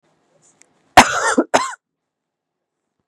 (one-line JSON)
{"cough_length": "3.1 s", "cough_amplitude": 32768, "cough_signal_mean_std_ratio": 0.28, "survey_phase": "beta (2021-08-13 to 2022-03-07)", "age": "18-44", "gender": "Female", "wearing_mask": "No", "symptom_runny_or_blocked_nose": true, "symptom_fatigue": true, "symptom_loss_of_taste": true, "symptom_other": true, "symptom_onset": "7 days", "smoker_status": "Never smoked", "respiratory_condition_asthma": false, "respiratory_condition_other": false, "recruitment_source": "REACT", "submission_delay": "1 day", "covid_test_result": "Positive", "covid_test_method": "RT-qPCR", "covid_ct_value": 18.6, "covid_ct_gene": "E gene", "influenza_a_test_result": "Negative", "influenza_b_test_result": "Negative"}